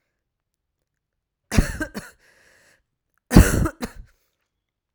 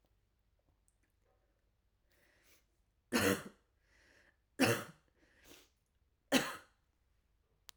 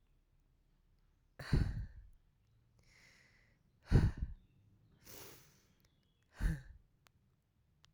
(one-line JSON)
{"cough_length": "4.9 s", "cough_amplitude": 32768, "cough_signal_mean_std_ratio": 0.23, "three_cough_length": "7.8 s", "three_cough_amplitude": 6155, "three_cough_signal_mean_std_ratio": 0.24, "exhalation_length": "7.9 s", "exhalation_amplitude": 4459, "exhalation_signal_mean_std_ratio": 0.27, "survey_phase": "alpha (2021-03-01 to 2021-08-12)", "age": "18-44", "gender": "Female", "wearing_mask": "No", "symptom_cough_any": true, "symptom_new_continuous_cough": true, "symptom_shortness_of_breath": true, "symptom_fatigue": true, "symptom_headache": true, "symptom_onset": "5 days", "smoker_status": "Never smoked", "respiratory_condition_asthma": false, "respiratory_condition_other": false, "recruitment_source": "Test and Trace", "submission_delay": "1 day", "covid_test_result": "Positive", "covid_test_method": "ePCR"}